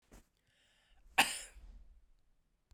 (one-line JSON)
{"cough_length": "2.7 s", "cough_amplitude": 7895, "cough_signal_mean_std_ratio": 0.22, "survey_phase": "beta (2021-08-13 to 2022-03-07)", "age": "45-64", "gender": "Female", "wearing_mask": "No", "symptom_cough_any": true, "symptom_runny_or_blocked_nose": true, "symptom_sore_throat": true, "symptom_fever_high_temperature": true, "symptom_headache": true, "symptom_change_to_sense_of_smell_or_taste": true, "symptom_loss_of_taste": true, "symptom_onset": "5 days", "smoker_status": "Ex-smoker", "respiratory_condition_asthma": false, "respiratory_condition_other": false, "recruitment_source": "Test and Trace", "submission_delay": "2 days", "covid_test_result": "Positive", "covid_test_method": "RT-qPCR"}